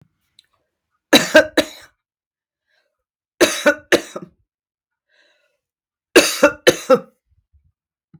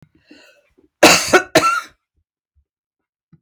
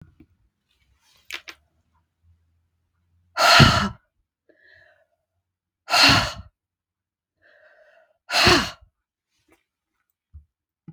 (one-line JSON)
{"three_cough_length": "8.2 s", "three_cough_amplitude": 32768, "three_cough_signal_mean_std_ratio": 0.27, "cough_length": "3.4 s", "cough_amplitude": 32768, "cough_signal_mean_std_ratio": 0.32, "exhalation_length": "10.9 s", "exhalation_amplitude": 32768, "exhalation_signal_mean_std_ratio": 0.27, "survey_phase": "beta (2021-08-13 to 2022-03-07)", "age": "65+", "gender": "Female", "wearing_mask": "No", "symptom_none": true, "smoker_status": "Ex-smoker", "respiratory_condition_asthma": false, "respiratory_condition_other": false, "recruitment_source": "REACT", "submission_delay": "2 days", "covid_test_result": "Negative", "covid_test_method": "RT-qPCR"}